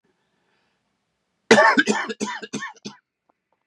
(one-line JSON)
{"three_cough_length": "3.7 s", "three_cough_amplitude": 31964, "three_cough_signal_mean_std_ratio": 0.32, "survey_phase": "beta (2021-08-13 to 2022-03-07)", "age": "45-64", "gender": "Male", "wearing_mask": "No", "symptom_cough_any": true, "symptom_runny_or_blocked_nose": true, "symptom_abdominal_pain": true, "symptom_fatigue": true, "symptom_headache": true, "symptom_onset": "5 days", "smoker_status": "Never smoked", "respiratory_condition_asthma": false, "respiratory_condition_other": false, "recruitment_source": "Test and Trace", "submission_delay": "1 day", "covid_test_result": "Positive", "covid_test_method": "RT-qPCR", "covid_ct_value": 18.4, "covid_ct_gene": "ORF1ab gene"}